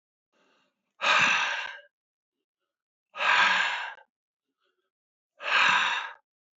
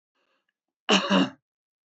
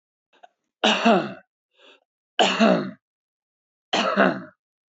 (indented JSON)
{
  "exhalation_length": "6.6 s",
  "exhalation_amplitude": 11871,
  "exhalation_signal_mean_std_ratio": 0.45,
  "cough_length": "1.9 s",
  "cough_amplitude": 12944,
  "cough_signal_mean_std_ratio": 0.35,
  "three_cough_length": "4.9 s",
  "three_cough_amplitude": 20759,
  "three_cough_signal_mean_std_ratio": 0.41,
  "survey_phase": "beta (2021-08-13 to 2022-03-07)",
  "age": "45-64",
  "gender": "Male",
  "wearing_mask": "No",
  "symptom_none": true,
  "smoker_status": "Never smoked",
  "respiratory_condition_asthma": false,
  "respiratory_condition_other": false,
  "recruitment_source": "REACT",
  "submission_delay": "8 days",
  "covid_test_result": "Negative",
  "covid_test_method": "RT-qPCR"
}